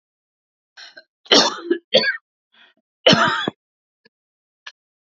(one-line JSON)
{"cough_length": "5.0 s", "cough_amplitude": 31135, "cough_signal_mean_std_ratio": 0.32, "survey_phase": "alpha (2021-03-01 to 2021-08-12)", "age": "45-64", "gender": "Female", "wearing_mask": "No", "symptom_none": true, "smoker_status": "Never smoked", "respiratory_condition_asthma": false, "respiratory_condition_other": false, "recruitment_source": "REACT", "submission_delay": "3 days", "covid_test_result": "Negative", "covid_test_method": "RT-qPCR"}